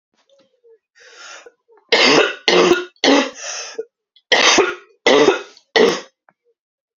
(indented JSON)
{
  "cough_length": "7.0 s",
  "cough_amplitude": 32767,
  "cough_signal_mean_std_ratio": 0.46,
  "survey_phase": "alpha (2021-03-01 to 2021-08-12)",
  "age": "18-44",
  "gender": "Female",
  "wearing_mask": "No",
  "symptom_cough_any": true,
  "symptom_new_continuous_cough": true,
  "symptom_shortness_of_breath": true,
  "symptom_fatigue": true,
  "symptom_fever_high_temperature": true,
  "symptom_headache": true,
  "symptom_change_to_sense_of_smell_or_taste": true,
  "symptom_loss_of_taste": true,
  "symptom_onset": "5 days",
  "smoker_status": "Never smoked",
  "respiratory_condition_asthma": false,
  "respiratory_condition_other": false,
  "recruitment_source": "Test and Trace",
  "submission_delay": "3 days",
  "covid_test_result": "Positive",
  "covid_test_method": "RT-qPCR",
  "covid_ct_value": 16.0,
  "covid_ct_gene": "ORF1ab gene",
  "covid_ct_mean": 16.7,
  "covid_viral_load": "3400000 copies/ml",
  "covid_viral_load_category": "High viral load (>1M copies/ml)"
}